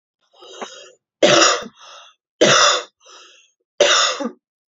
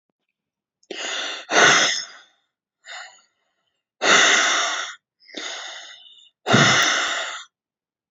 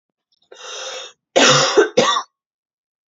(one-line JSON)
{"three_cough_length": "4.8 s", "three_cough_amplitude": 32768, "three_cough_signal_mean_std_ratio": 0.43, "exhalation_length": "8.1 s", "exhalation_amplitude": 26127, "exhalation_signal_mean_std_ratio": 0.47, "cough_length": "3.1 s", "cough_amplitude": 29619, "cough_signal_mean_std_ratio": 0.44, "survey_phase": "beta (2021-08-13 to 2022-03-07)", "age": "18-44", "gender": "Female", "wearing_mask": "No", "symptom_cough_any": true, "symptom_sore_throat": true, "symptom_onset": "8 days", "smoker_status": "Never smoked", "respiratory_condition_asthma": true, "respiratory_condition_other": false, "recruitment_source": "REACT", "submission_delay": "1 day", "covid_test_result": "Negative", "covid_test_method": "RT-qPCR"}